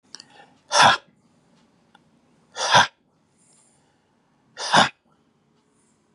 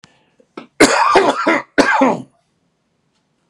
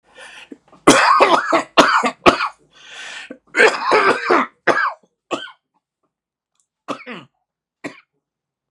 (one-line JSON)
{"exhalation_length": "6.1 s", "exhalation_amplitude": 30896, "exhalation_signal_mean_std_ratio": 0.27, "cough_length": "3.5 s", "cough_amplitude": 32768, "cough_signal_mean_std_ratio": 0.47, "three_cough_length": "8.7 s", "three_cough_amplitude": 32768, "three_cough_signal_mean_std_ratio": 0.42, "survey_phase": "beta (2021-08-13 to 2022-03-07)", "age": "45-64", "gender": "Male", "wearing_mask": "No", "symptom_new_continuous_cough": true, "symptom_shortness_of_breath": true, "symptom_sore_throat": true, "symptom_diarrhoea": true, "symptom_fatigue": true, "symptom_fever_high_temperature": true, "symptom_headache": true, "symptom_onset": "3 days", "smoker_status": "Never smoked", "respiratory_condition_asthma": false, "respiratory_condition_other": false, "recruitment_source": "Test and Trace", "submission_delay": "2 days", "covid_test_result": "Positive", "covid_test_method": "ePCR"}